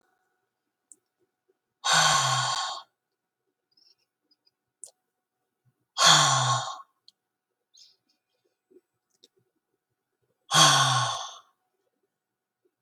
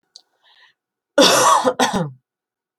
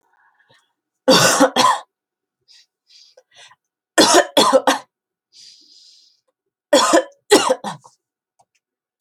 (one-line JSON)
{"exhalation_length": "12.8 s", "exhalation_amplitude": 19039, "exhalation_signal_mean_std_ratio": 0.33, "cough_length": "2.8 s", "cough_amplitude": 28374, "cough_signal_mean_std_ratio": 0.44, "three_cough_length": "9.0 s", "three_cough_amplitude": 32139, "three_cough_signal_mean_std_ratio": 0.36, "survey_phase": "alpha (2021-03-01 to 2021-08-12)", "age": "18-44", "gender": "Female", "wearing_mask": "No", "symptom_none": true, "symptom_onset": "4 days", "smoker_status": "Never smoked", "respiratory_condition_asthma": false, "respiratory_condition_other": false, "recruitment_source": "REACT", "submission_delay": "3 days", "covid_test_result": "Negative", "covid_test_method": "RT-qPCR"}